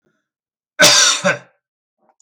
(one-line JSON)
{"cough_length": "2.2 s", "cough_amplitude": 32768, "cough_signal_mean_std_ratio": 0.39, "survey_phase": "beta (2021-08-13 to 2022-03-07)", "age": "45-64", "gender": "Male", "wearing_mask": "No", "symptom_none": true, "smoker_status": "Never smoked", "respiratory_condition_asthma": false, "respiratory_condition_other": false, "recruitment_source": "REACT", "submission_delay": "2 days", "covid_test_result": "Negative", "covid_test_method": "RT-qPCR", "influenza_a_test_result": "Negative", "influenza_b_test_result": "Negative"}